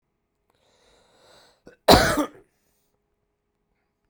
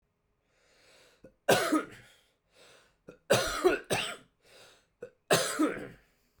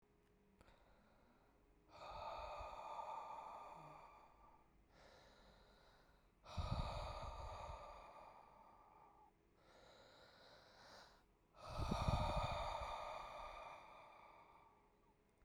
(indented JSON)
{
  "cough_length": "4.1 s",
  "cough_amplitude": 32768,
  "cough_signal_mean_std_ratio": 0.21,
  "three_cough_length": "6.4 s",
  "three_cough_amplitude": 10007,
  "three_cough_signal_mean_std_ratio": 0.38,
  "exhalation_length": "15.4 s",
  "exhalation_amplitude": 1639,
  "exhalation_signal_mean_std_ratio": 0.53,
  "survey_phase": "beta (2021-08-13 to 2022-03-07)",
  "age": "18-44",
  "gender": "Male",
  "wearing_mask": "No",
  "symptom_fatigue": true,
  "symptom_onset": "6 days",
  "smoker_status": "Current smoker (11 or more cigarettes per day)",
  "respiratory_condition_asthma": false,
  "respiratory_condition_other": false,
  "recruitment_source": "REACT",
  "submission_delay": "2 days",
  "covid_test_result": "Negative",
  "covid_test_method": "RT-qPCR"
}